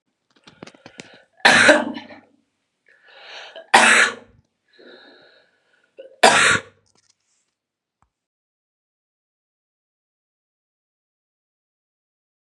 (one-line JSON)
{"three_cough_length": "12.5 s", "three_cough_amplitude": 32768, "three_cough_signal_mean_std_ratio": 0.25, "survey_phase": "beta (2021-08-13 to 2022-03-07)", "age": "45-64", "gender": "Female", "wearing_mask": "No", "symptom_cough_any": true, "symptom_runny_or_blocked_nose": true, "symptom_fatigue": true, "symptom_onset": "3 days", "smoker_status": "Never smoked", "respiratory_condition_asthma": false, "respiratory_condition_other": false, "recruitment_source": "Test and Trace", "submission_delay": "2 days", "covid_test_result": "Positive", "covid_test_method": "RT-qPCR", "covid_ct_value": 22.6, "covid_ct_gene": "ORF1ab gene", "covid_ct_mean": 22.9, "covid_viral_load": "32000 copies/ml", "covid_viral_load_category": "Low viral load (10K-1M copies/ml)"}